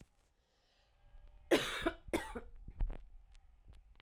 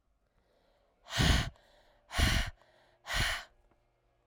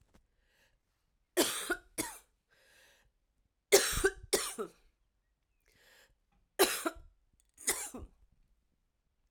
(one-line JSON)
{"cough_length": "4.0 s", "cough_amplitude": 4684, "cough_signal_mean_std_ratio": 0.39, "exhalation_length": "4.3 s", "exhalation_amplitude": 6989, "exhalation_signal_mean_std_ratio": 0.4, "three_cough_length": "9.3 s", "three_cough_amplitude": 11091, "three_cough_signal_mean_std_ratio": 0.29, "survey_phase": "alpha (2021-03-01 to 2021-08-12)", "age": "18-44", "gender": "Female", "wearing_mask": "No", "symptom_shortness_of_breath": true, "symptom_fatigue": true, "symptom_fever_high_temperature": true, "symptom_headache": true, "symptom_onset": "2 days", "smoker_status": "Never smoked", "respiratory_condition_asthma": false, "respiratory_condition_other": false, "recruitment_source": "Test and Trace", "submission_delay": "1 day", "covid_test_result": "Positive", "covid_test_method": "RT-qPCR", "covid_ct_value": 20.5, "covid_ct_gene": "ORF1ab gene", "covid_ct_mean": 20.9, "covid_viral_load": "140000 copies/ml", "covid_viral_load_category": "Low viral load (10K-1M copies/ml)"}